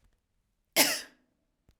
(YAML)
cough_length: 1.8 s
cough_amplitude: 14539
cough_signal_mean_std_ratio: 0.26
survey_phase: alpha (2021-03-01 to 2021-08-12)
age: 18-44
gender: Female
wearing_mask: 'No'
symptom_cough_any: true
symptom_fatigue: true
symptom_fever_high_temperature: true
symptom_headache: true
symptom_change_to_sense_of_smell_or_taste: true
symptom_onset: 4 days
smoker_status: Ex-smoker
respiratory_condition_asthma: false
respiratory_condition_other: false
recruitment_source: Test and Trace
submission_delay: 2 days
covid_test_result: Positive
covid_test_method: RT-qPCR
covid_ct_value: 15.4
covid_ct_gene: ORF1ab gene
covid_ct_mean: 15.9
covid_viral_load: 6300000 copies/ml
covid_viral_load_category: High viral load (>1M copies/ml)